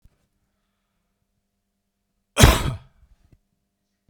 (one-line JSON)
{"cough_length": "4.1 s", "cough_amplitude": 32768, "cough_signal_mean_std_ratio": 0.2, "survey_phase": "beta (2021-08-13 to 2022-03-07)", "age": "45-64", "gender": "Male", "wearing_mask": "No", "symptom_none": true, "smoker_status": "Never smoked", "respiratory_condition_asthma": false, "respiratory_condition_other": false, "recruitment_source": "REACT", "submission_delay": "1 day", "covid_test_result": "Negative", "covid_test_method": "RT-qPCR"}